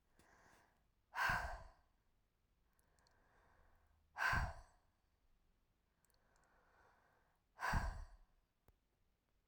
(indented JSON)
{
  "exhalation_length": "9.5 s",
  "exhalation_amplitude": 1673,
  "exhalation_signal_mean_std_ratio": 0.31,
  "survey_phase": "beta (2021-08-13 to 2022-03-07)",
  "age": "45-64",
  "gender": "Female",
  "wearing_mask": "No",
  "symptom_other": true,
  "smoker_status": "Never smoked",
  "respiratory_condition_asthma": false,
  "respiratory_condition_other": false,
  "recruitment_source": "Test and Trace",
  "submission_delay": "2 days",
  "covid_test_result": "Positive",
  "covid_test_method": "RT-qPCR",
  "covid_ct_value": 37.0,
  "covid_ct_gene": "N gene"
}